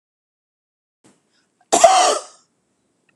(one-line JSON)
{"cough_length": "3.2 s", "cough_amplitude": 32768, "cough_signal_mean_std_ratio": 0.3, "survey_phase": "beta (2021-08-13 to 2022-03-07)", "age": "65+", "gender": "Female", "wearing_mask": "No", "symptom_none": true, "smoker_status": "Never smoked", "respiratory_condition_asthma": false, "respiratory_condition_other": false, "recruitment_source": "REACT", "submission_delay": "2 days", "covid_test_result": "Negative", "covid_test_method": "RT-qPCR"}